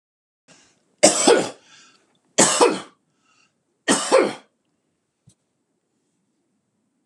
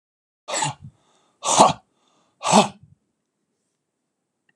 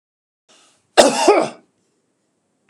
{
  "three_cough_length": "7.1 s",
  "three_cough_amplitude": 32767,
  "three_cough_signal_mean_std_ratio": 0.31,
  "exhalation_length": "4.6 s",
  "exhalation_amplitude": 32767,
  "exhalation_signal_mean_std_ratio": 0.28,
  "cough_length": "2.7 s",
  "cough_amplitude": 32768,
  "cough_signal_mean_std_ratio": 0.31,
  "survey_phase": "beta (2021-08-13 to 2022-03-07)",
  "age": "45-64",
  "gender": "Male",
  "wearing_mask": "No",
  "symptom_none": true,
  "smoker_status": "Ex-smoker",
  "respiratory_condition_asthma": false,
  "respiratory_condition_other": false,
  "recruitment_source": "REACT",
  "submission_delay": "2 days",
  "covid_test_result": "Negative",
  "covid_test_method": "RT-qPCR"
}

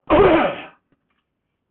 {
  "cough_length": "1.7 s",
  "cough_amplitude": 18382,
  "cough_signal_mean_std_ratio": 0.44,
  "survey_phase": "beta (2021-08-13 to 2022-03-07)",
  "age": "65+",
  "gender": "Male",
  "wearing_mask": "No",
  "symptom_none": true,
  "smoker_status": "Ex-smoker",
  "respiratory_condition_asthma": false,
  "respiratory_condition_other": false,
  "recruitment_source": "REACT",
  "submission_delay": "6 days",
  "covid_test_result": "Negative",
  "covid_test_method": "RT-qPCR"
}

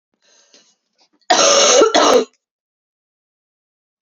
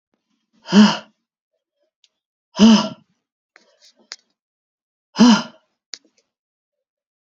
{
  "cough_length": "4.0 s",
  "cough_amplitude": 32767,
  "cough_signal_mean_std_ratio": 0.41,
  "exhalation_length": "7.3 s",
  "exhalation_amplitude": 32768,
  "exhalation_signal_mean_std_ratio": 0.26,
  "survey_phase": "beta (2021-08-13 to 2022-03-07)",
  "age": "18-44",
  "gender": "Female",
  "wearing_mask": "No",
  "symptom_cough_any": true,
  "symptom_new_continuous_cough": true,
  "symptom_runny_or_blocked_nose": true,
  "symptom_sore_throat": true,
  "symptom_headache": true,
  "symptom_change_to_sense_of_smell_or_taste": true,
  "symptom_loss_of_taste": true,
  "symptom_onset": "3 days",
  "smoker_status": "Never smoked",
  "respiratory_condition_asthma": false,
  "respiratory_condition_other": false,
  "recruitment_source": "Test and Trace",
  "submission_delay": "2 days",
  "covid_test_result": "Positive",
  "covid_test_method": "RT-qPCR",
  "covid_ct_value": 16.0,
  "covid_ct_gene": "ORF1ab gene",
  "covid_ct_mean": 16.5,
  "covid_viral_load": "3700000 copies/ml",
  "covid_viral_load_category": "High viral load (>1M copies/ml)"
}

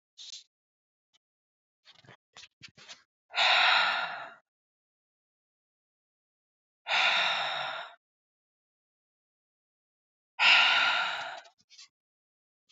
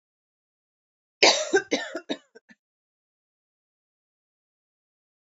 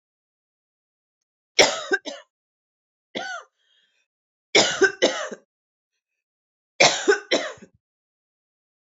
{
  "exhalation_length": "12.7 s",
  "exhalation_amplitude": 12257,
  "exhalation_signal_mean_std_ratio": 0.36,
  "cough_length": "5.2 s",
  "cough_amplitude": 31743,
  "cough_signal_mean_std_ratio": 0.22,
  "three_cough_length": "8.9 s",
  "three_cough_amplitude": 32695,
  "three_cough_signal_mean_std_ratio": 0.29,
  "survey_phase": "beta (2021-08-13 to 2022-03-07)",
  "age": "18-44",
  "gender": "Female",
  "wearing_mask": "No",
  "symptom_cough_any": true,
  "symptom_runny_or_blocked_nose": true,
  "symptom_onset": "2 days",
  "smoker_status": "Never smoked",
  "respiratory_condition_asthma": false,
  "respiratory_condition_other": false,
  "recruitment_source": "Test and Trace",
  "submission_delay": "2 days",
  "covid_test_result": "Positive",
  "covid_test_method": "RT-qPCR",
  "covid_ct_value": 16.3,
  "covid_ct_gene": "ORF1ab gene",
  "covid_ct_mean": 16.8,
  "covid_viral_load": "3100000 copies/ml",
  "covid_viral_load_category": "High viral load (>1M copies/ml)"
}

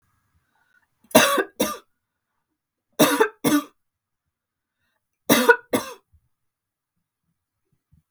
{
  "three_cough_length": "8.1 s",
  "three_cough_amplitude": 32768,
  "three_cough_signal_mean_std_ratio": 0.29,
  "survey_phase": "beta (2021-08-13 to 2022-03-07)",
  "age": "45-64",
  "gender": "Female",
  "wearing_mask": "No",
  "symptom_none": true,
  "smoker_status": "Never smoked",
  "respiratory_condition_asthma": false,
  "respiratory_condition_other": false,
  "recruitment_source": "REACT",
  "submission_delay": "1 day",
  "covid_test_result": "Negative",
  "covid_test_method": "RT-qPCR",
  "influenza_a_test_result": "Negative",
  "influenza_b_test_result": "Negative"
}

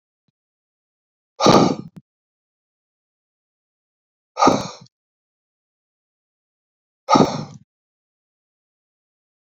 {
  "exhalation_length": "9.6 s",
  "exhalation_amplitude": 30043,
  "exhalation_signal_mean_std_ratio": 0.23,
  "survey_phase": "beta (2021-08-13 to 2022-03-07)",
  "age": "65+",
  "gender": "Male",
  "wearing_mask": "No",
  "symptom_cough_any": true,
  "symptom_onset": "12 days",
  "smoker_status": "Never smoked",
  "respiratory_condition_asthma": true,
  "respiratory_condition_other": true,
  "recruitment_source": "REACT",
  "submission_delay": "7 days",
  "covid_test_result": "Negative",
  "covid_test_method": "RT-qPCR"
}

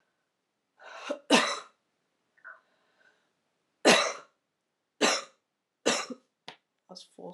{
  "three_cough_length": "7.3 s",
  "three_cough_amplitude": 15365,
  "three_cough_signal_mean_std_ratio": 0.29,
  "survey_phase": "alpha (2021-03-01 to 2021-08-12)",
  "age": "18-44",
  "gender": "Female",
  "wearing_mask": "No",
  "symptom_cough_any": true,
  "symptom_new_continuous_cough": true,
  "symptom_shortness_of_breath": true,
  "symptom_headache": true,
  "symptom_change_to_sense_of_smell_or_taste": true,
  "symptom_loss_of_taste": true,
  "symptom_onset": "4 days",
  "smoker_status": "Never smoked",
  "respiratory_condition_asthma": false,
  "respiratory_condition_other": false,
  "recruitment_source": "Test and Trace",
  "submission_delay": "2 days",
  "covid_test_result": "Positive",
  "covid_test_method": "RT-qPCR"
}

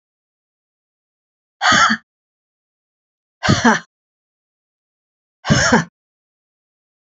{
  "exhalation_length": "7.1 s",
  "exhalation_amplitude": 29041,
  "exhalation_signal_mean_std_ratio": 0.3,
  "survey_phase": "beta (2021-08-13 to 2022-03-07)",
  "age": "45-64",
  "gender": "Female",
  "wearing_mask": "No",
  "symptom_cough_any": true,
  "symptom_runny_or_blocked_nose": true,
  "symptom_sore_throat": true,
  "symptom_headache": true,
  "smoker_status": "Never smoked",
  "respiratory_condition_asthma": false,
  "respiratory_condition_other": false,
  "recruitment_source": "Test and Trace",
  "submission_delay": "1 day",
  "covid_test_result": "Positive",
  "covid_test_method": "RT-qPCR",
  "covid_ct_value": 32.4,
  "covid_ct_gene": "N gene"
}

